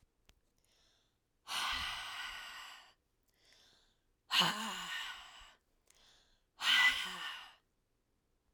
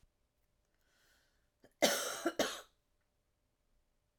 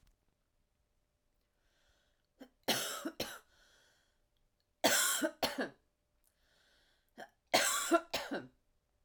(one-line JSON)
{"exhalation_length": "8.5 s", "exhalation_amplitude": 4572, "exhalation_signal_mean_std_ratio": 0.39, "cough_length": "4.2 s", "cough_amplitude": 5533, "cough_signal_mean_std_ratio": 0.28, "three_cough_length": "9.0 s", "three_cough_amplitude": 7802, "three_cough_signal_mean_std_ratio": 0.34, "survey_phase": "alpha (2021-03-01 to 2021-08-12)", "age": "45-64", "gender": "Female", "wearing_mask": "No", "symptom_none": true, "smoker_status": "Never smoked", "respiratory_condition_asthma": false, "respiratory_condition_other": false, "recruitment_source": "REACT", "submission_delay": "8 days", "covid_test_result": "Negative", "covid_test_method": "RT-qPCR"}